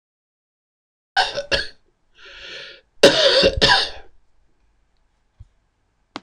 {"cough_length": "6.2 s", "cough_amplitude": 26028, "cough_signal_mean_std_ratio": 0.35, "survey_phase": "beta (2021-08-13 to 2022-03-07)", "age": "65+", "gender": "Male", "wearing_mask": "No", "symptom_none": true, "smoker_status": "Ex-smoker", "respiratory_condition_asthma": false, "respiratory_condition_other": false, "recruitment_source": "REACT", "submission_delay": "0 days", "covid_test_result": "Negative", "covid_test_method": "RT-qPCR", "influenza_a_test_result": "Negative", "influenza_b_test_result": "Negative"}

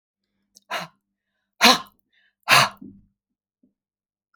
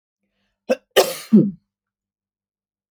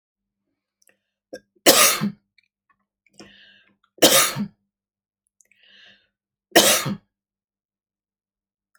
{"exhalation_length": "4.4 s", "exhalation_amplitude": 31792, "exhalation_signal_mean_std_ratio": 0.24, "cough_length": "2.9 s", "cough_amplitude": 31719, "cough_signal_mean_std_ratio": 0.27, "three_cough_length": "8.8 s", "three_cough_amplitude": 32768, "three_cough_signal_mean_std_ratio": 0.27, "survey_phase": "alpha (2021-03-01 to 2021-08-12)", "age": "65+", "gender": "Female", "wearing_mask": "No", "symptom_none": true, "smoker_status": "Never smoked", "respiratory_condition_asthma": false, "respiratory_condition_other": false, "recruitment_source": "REACT", "submission_delay": "1 day", "covid_test_result": "Negative", "covid_test_method": "RT-qPCR"}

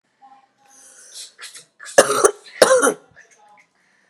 {"cough_length": "4.1 s", "cough_amplitude": 32768, "cough_signal_mean_std_ratio": 0.31, "survey_phase": "beta (2021-08-13 to 2022-03-07)", "age": "18-44", "gender": "Female", "wearing_mask": "No", "symptom_runny_or_blocked_nose": true, "symptom_headache": true, "symptom_change_to_sense_of_smell_or_taste": true, "symptom_loss_of_taste": true, "symptom_onset": "4 days", "smoker_status": "Ex-smoker", "respiratory_condition_asthma": false, "respiratory_condition_other": false, "recruitment_source": "Test and Trace", "submission_delay": "1 day", "covid_test_result": "Positive", "covid_test_method": "RT-qPCR", "covid_ct_value": 22.8, "covid_ct_gene": "ORF1ab gene"}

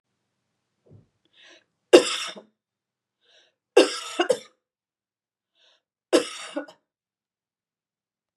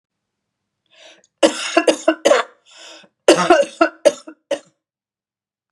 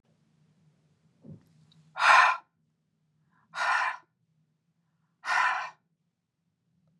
{"three_cough_length": "8.4 s", "three_cough_amplitude": 32539, "three_cough_signal_mean_std_ratio": 0.2, "cough_length": "5.7 s", "cough_amplitude": 32768, "cough_signal_mean_std_ratio": 0.34, "exhalation_length": "7.0 s", "exhalation_amplitude": 17381, "exhalation_signal_mean_std_ratio": 0.3, "survey_phase": "beta (2021-08-13 to 2022-03-07)", "age": "45-64", "gender": "Female", "wearing_mask": "No", "symptom_none": true, "smoker_status": "Never smoked", "respiratory_condition_asthma": false, "respiratory_condition_other": false, "recruitment_source": "REACT", "submission_delay": "2 days", "covid_test_result": "Negative", "covid_test_method": "RT-qPCR"}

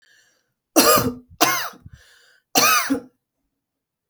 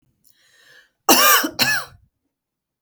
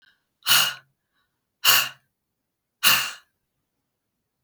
{"three_cough_length": "4.1 s", "three_cough_amplitude": 32768, "three_cough_signal_mean_std_ratio": 0.4, "cough_length": "2.8 s", "cough_amplitude": 32768, "cough_signal_mean_std_ratio": 0.37, "exhalation_length": "4.4 s", "exhalation_amplitude": 28965, "exhalation_signal_mean_std_ratio": 0.31, "survey_phase": "beta (2021-08-13 to 2022-03-07)", "age": "45-64", "gender": "Female", "wearing_mask": "No", "symptom_none": true, "smoker_status": "Never smoked", "respiratory_condition_asthma": true, "respiratory_condition_other": false, "recruitment_source": "REACT", "submission_delay": "1 day", "covid_test_result": "Negative", "covid_test_method": "RT-qPCR", "influenza_a_test_result": "Negative", "influenza_b_test_result": "Negative"}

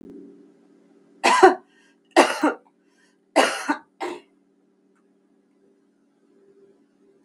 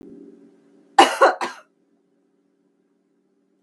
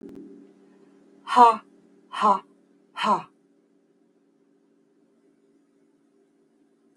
{"three_cough_length": "7.2 s", "three_cough_amplitude": 32768, "three_cough_signal_mean_std_ratio": 0.27, "cough_length": "3.6 s", "cough_amplitude": 32767, "cough_signal_mean_std_ratio": 0.23, "exhalation_length": "7.0 s", "exhalation_amplitude": 25866, "exhalation_signal_mean_std_ratio": 0.25, "survey_phase": "beta (2021-08-13 to 2022-03-07)", "age": "65+", "gender": "Female", "wearing_mask": "No", "symptom_none": true, "symptom_onset": "13 days", "smoker_status": "Never smoked", "respiratory_condition_asthma": false, "respiratory_condition_other": false, "recruitment_source": "REACT", "submission_delay": "2 days", "covid_test_result": "Negative", "covid_test_method": "RT-qPCR", "influenza_a_test_result": "Negative", "influenza_b_test_result": "Negative"}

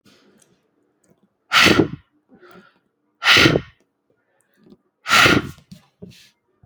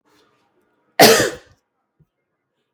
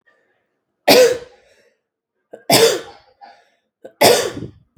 {"exhalation_length": "6.7 s", "exhalation_amplitude": 32767, "exhalation_signal_mean_std_ratio": 0.33, "cough_length": "2.7 s", "cough_amplitude": 32768, "cough_signal_mean_std_ratio": 0.26, "three_cough_length": "4.8 s", "three_cough_amplitude": 32767, "three_cough_signal_mean_std_ratio": 0.36, "survey_phase": "beta (2021-08-13 to 2022-03-07)", "age": "18-44", "gender": "Female", "wearing_mask": "No", "symptom_none": true, "smoker_status": "Never smoked", "respiratory_condition_asthma": false, "respiratory_condition_other": false, "recruitment_source": "REACT", "submission_delay": "21 days", "covid_test_result": "Negative", "covid_test_method": "RT-qPCR"}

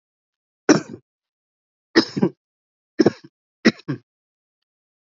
{"cough_length": "5.0 s", "cough_amplitude": 29584, "cough_signal_mean_std_ratio": 0.23, "survey_phase": "beta (2021-08-13 to 2022-03-07)", "age": "18-44", "gender": "Male", "wearing_mask": "No", "symptom_fatigue": true, "smoker_status": "Never smoked", "respiratory_condition_asthma": false, "respiratory_condition_other": false, "recruitment_source": "Test and Trace", "submission_delay": "1 day", "covid_test_result": "Positive", "covid_test_method": "RT-qPCR", "covid_ct_value": 21.2, "covid_ct_gene": "N gene"}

